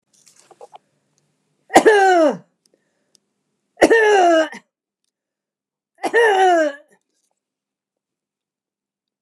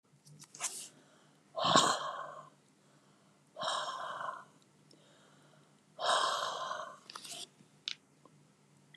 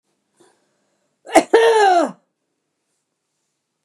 {"three_cough_length": "9.2 s", "three_cough_amplitude": 29204, "three_cough_signal_mean_std_ratio": 0.38, "exhalation_length": "9.0 s", "exhalation_amplitude": 12465, "exhalation_signal_mean_std_ratio": 0.42, "cough_length": "3.8 s", "cough_amplitude": 29204, "cough_signal_mean_std_ratio": 0.34, "survey_phase": "beta (2021-08-13 to 2022-03-07)", "age": "65+", "gender": "Female", "wearing_mask": "No", "symptom_none": true, "smoker_status": "Never smoked", "respiratory_condition_asthma": true, "respiratory_condition_other": true, "recruitment_source": "REACT", "submission_delay": "1 day", "covid_test_result": "Negative", "covid_test_method": "RT-qPCR", "influenza_a_test_result": "Negative", "influenza_b_test_result": "Negative"}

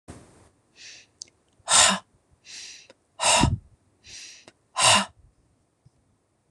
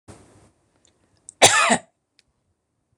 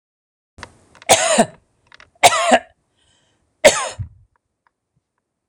{"exhalation_length": "6.5 s", "exhalation_amplitude": 21741, "exhalation_signal_mean_std_ratio": 0.32, "cough_length": "3.0 s", "cough_amplitude": 26028, "cough_signal_mean_std_ratio": 0.27, "three_cough_length": "5.5 s", "three_cough_amplitude": 26028, "three_cough_signal_mean_std_ratio": 0.31, "survey_phase": "beta (2021-08-13 to 2022-03-07)", "age": "45-64", "gender": "Female", "wearing_mask": "No", "symptom_none": true, "smoker_status": "Never smoked", "respiratory_condition_asthma": false, "respiratory_condition_other": false, "recruitment_source": "REACT", "submission_delay": "1 day", "covid_test_result": "Negative", "covid_test_method": "RT-qPCR", "influenza_a_test_result": "Negative", "influenza_b_test_result": "Negative"}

